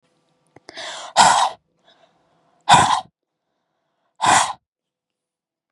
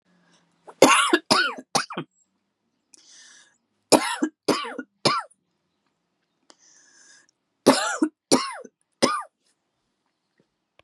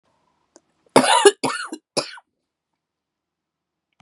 {"exhalation_length": "5.7 s", "exhalation_amplitude": 32768, "exhalation_signal_mean_std_ratio": 0.33, "three_cough_length": "10.8 s", "three_cough_amplitude": 32723, "three_cough_signal_mean_std_ratio": 0.32, "cough_length": "4.0 s", "cough_amplitude": 32768, "cough_signal_mean_std_ratio": 0.27, "survey_phase": "beta (2021-08-13 to 2022-03-07)", "age": "45-64", "gender": "Female", "wearing_mask": "No", "symptom_cough_any": true, "symptom_runny_or_blocked_nose": true, "symptom_other": true, "symptom_onset": "3 days", "smoker_status": "Never smoked", "respiratory_condition_asthma": false, "respiratory_condition_other": false, "recruitment_source": "Test and Trace", "submission_delay": "1 day", "covid_test_result": "Positive", "covid_test_method": "RT-qPCR", "covid_ct_value": 30.1, "covid_ct_gene": "N gene"}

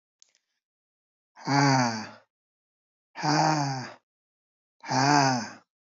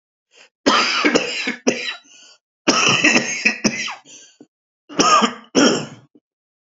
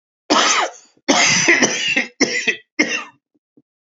{"exhalation_length": "6.0 s", "exhalation_amplitude": 14046, "exhalation_signal_mean_std_ratio": 0.44, "three_cough_length": "6.7 s", "three_cough_amplitude": 32767, "three_cough_signal_mean_std_ratio": 0.52, "cough_length": "3.9 s", "cough_amplitude": 32768, "cough_signal_mean_std_ratio": 0.58, "survey_phase": "alpha (2021-03-01 to 2021-08-12)", "age": "45-64", "gender": "Male", "wearing_mask": "No", "symptom_new_continuous_cough": true, "symptom_onset": "2 days", "smoker_status": "Never smoked", "respiratory_condition_asthma": false, "respiratory_condition_other": false, "recruitment_source": "Test and Trace", "submission_delay": "2 days", "covid_test_result": "Positive", "covid_test_method": "RT-qPCR", "covid_ct_value": 15.4, "covid_ct_gene": "N gene", "covid_ct_mean": 15.5, "covid_viral_load": "8300000 copies/ml", "covid_viral_load_category": "High viral load (>1M copies/ml)"}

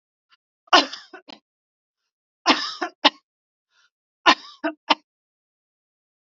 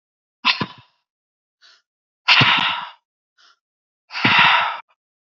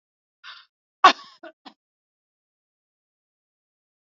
{"three_cough_length": "6.2 s", "three_cough_amplitude": 30807, "three_cough_signal_mean_std_ratio": 0.22, "exhalation_length": "5.4 s", "exhalation_amplitude": 31681, "exhalation_signal_mean_std_ratio": 0.39, "cough_length": "4.1 s", "cough_amplitude": 32767, "cough_signal_mean_std_ratio": 0.12, "survey_phase": "beta (2021-08-13 to 2022-03-07)", "age": "65+", "gender": "Female", "wearing_mask": "No", "symptom_runny_or_blocked_nose": true, "smoker_status": "Never smoked", "respiratory_condition_asthma": false, "respiratory_condition_other": false, "recruitment_source": "Test and Trace", "submission_delay": "0 days", "covid_test_result": "Negative", "covid_test_method": "LFT"}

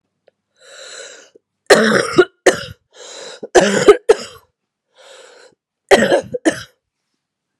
{"three_cough_length": "7.6 s", "three_cough_amplitude": 32768, "three_cough_signal_mean_std_ratio": 0.35, "survey_phase": "beta (2021-08-13 to 2022-03-07)", "age": "45-64", "gender": "Female", "wearing_mask": "No", "symptom_cough_any": true, "symptom_new_continuous_cough": true, "symptom_runny_or_blocked_nose": true, "symptom_fatigue": true, "symptom_fever_high_temperature": true, "symptom_headache": true, "symptom_change_to_sense_of_smell_or_taste": true, "symptom_loss_of_taste": true, "symptom_onset": "5 days", "smoker_status": "Never smoked", "respiratory_condition_asthma": false, "respiratory_condition_other": false, "recruitment_source": "Test and Trace", "submission_delay": "2 days", "covid_test_result": "Positive", "covid_test_method": "RT-qPCR", "covid_ct_value": 17.1, "covid_ct_gene": "ORF1ab gene", "covid_ct_mean": 17.6, "covid_viral_load": "1700000 copies/ml", "covid_viral_load_category": "High viral load (>1M copies/ml)"}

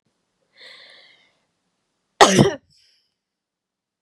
{"cough_length": "4.0 s", "cough_amplitude": 32768, "cough_signal_mean_std_ratio": 0.21, "survey_phase": "beta (2021-08-13 to 2022-03-07)", "age": "18-44", "gender": "Female", "wearing_mask": "No", "symptom_diarrhoea": true, "smoker_status": "Never smoked", "respiratory_condition_asthma": false, "respiratory_condition_other": false, "recruitment_source": "Test and Trace", "submission_delay": "3 days", "covid_test_result": "Negative", "covid_test_method": "RT-qPCR"}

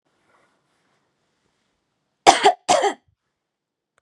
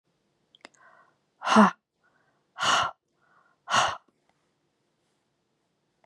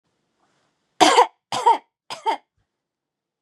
{"cough_length": "4.0 s", "cough_amplitude": 32768, "cough_signal_mean_std_ratio": 0.24, "exhalation_length": "6.1 s", "exhalation_amplitude": 20258, "exhalation_signal_mean_std_ratio": 0.27, "three_cough_length": "3.4 s", "three_cough_amplitude": 31345, "three_cough_signal_mean_std_ratio": 0.31, "survey_phase": "beta (2021-08-13 to 2022-03-07)", "age": "18-44", "gender": "Female", "wearing_mask": "No", "symptom_none": true, "smoker_status": "Never smoked", "respiratory_condition_asthma": false, "respiratory_condition_other": false, "recruitment_source": "REACT", "submission_delay": "1 day", "covid_test_result": "Negative", "covid_test_method": "RT-qPCR", "influenza_a_test_result": "Negative", "influenza_b_test_result": "Negative"}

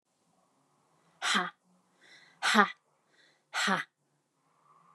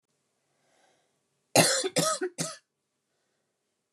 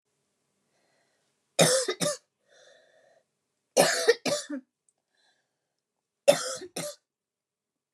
{"exhalation_length": "4.9 s", "exhalation_amplitude": 14793, "exhalation_signal_mean_std_ratio": 0.3, "cough_length": "3.9 s", "cough_amplitude": 17408, "cough_signal_mean_std_ratio": 0.32, "three_cough_length": "7.9 s", "three_cough_amplitude": 18827, "three_cough_signal_mean_std_ratio": 0.3, "survey_phase": "beta (2021-08-13 to 2022-03-07)", "age": "18-44", "gender": "Female", "wearing_mask": "No", "symptom_cough_any": true, "symptom_runny_or_blocked_nose": true, "symptom_fatigue": true, "symptom_other": true, "smoker_status": "Never smoked", "respiratory_condition_asthma": true, "respiratory_condition_other": false, "recruitment_source": "Test and Trace", "submission_delay": "2 days", "covid_test_result": "Positive", "covid_test_method": "RT-qPCR", "covid_ct_value": 25.5, "covid_ct_gene": "N gene"}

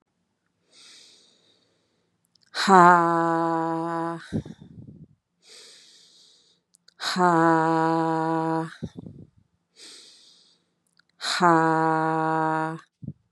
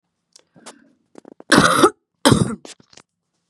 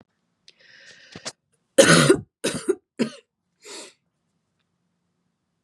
{"exhalation_length": "13.3 s", "exhalation_amplitude": 29047, "exhalation_signal_mean_std_ratio": 0.4, "cough_length": "3.5 s", "cough_amplitude": 32768, "cough_signal_mean_std_ratio": 0.33, "three_cough_length": "5.6 s", "three_cough_amplitude": 30924, "three_cough_signal_mean_std_ratio": 0.26, "survey_phase": "beta (2021-08-13 to 2022-03-07)", "age": "18-44", "gender": "Female", "wearing_mask": "No", "symptom_cough_any": true, "symptom_abdominal_pain": true, "symptom_fatigue": true, "symptom_fever_high_temperature": true, "symptom_headache": true, "symptom_change_to_sense_of_smell_or_taste": true, "symptom_loss_of_taste": true, "symptom_onset": "29 days", "smoker_status": "Ex-smoker", "respiratory_condition_asthma": false, "respiratory_condition_other": false, "recruitment_source": "Test and Trace", "submission_delay": "1 day", "covid_test_result": "Positive", "covid_test_method": "ePCR"}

